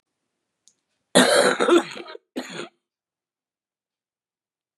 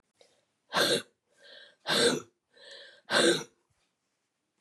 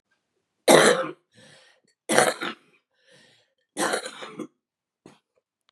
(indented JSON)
{
  "cough_length": "4.8 s",
  "cough_amplitude": 32281,
  "cough_signal_mean_std_ratio": 0.32,
  "exhalation_length": "4.6 s",
  "exhalation_amplitude": 8709,
  "exhalation_signal_mean_std_ratio": 0.37,
  "three_cough_length": "5.7 s",
  "three_cough_amplitude": 31717,
  "three_cough_signal_mean_std_ratio": 0.3,
  "survey_phase": "beta (2021-08-13 to 2022-03-07)",
  "age": "65+",
  "gender": "Female",
  "wearing_mask": "No",
  "symptom_cough_any": true,
  "symptom_new_continuous_cough": true,
  "symptom_runny_or_blocked_nose": true,
  "symptom_sore_throat": true,
  "symptom_fever_high_temperature": true,
  "symptom_change_to_sense_of_smell_or_taste": true,
  "symptom_loss_of_taste": true,
  "symptom_onset": "5 days",
  "smoker_status": "Ex-smoker",
  "respiratory_condition_asthma": false,
  "respiratory_condition_other": false,
  "recruitment_source": "Test and Trace",
  "submission_delay": "1 day",
  "covid_test_result": "Positive",
  "covid_test_method": "ePCR"
}